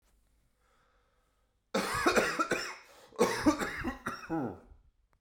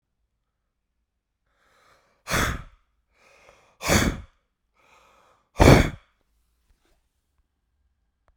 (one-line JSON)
{"cough_length": "5.2 s", "cough_amplitude": 7588, "cough_signal_mean_std_ratio": 0.48, "exhalation_length": "8.4 s", "exhalation_amplitude": 32767, "exhalation_signal_mean_std_ratio": 0.22, "survey_phase": "beta (2021-08-13 to 2022-03-07)", "age": "18-44", "gender": "Female", "wearing_mask": "No", "symptom_change_to_sense_of_smell_or_taste": true, "symptom_loss_of_taste": true, "smoker_status": "Ex-smoker", "respiratory_condition_asthma": false, "respiratory_condition_other": false, "recruitment_source": "Test and Trace", "submission_delay": "2 days", "covid_test_result": "Negative", "covid_test_method": "RT-qPCR"}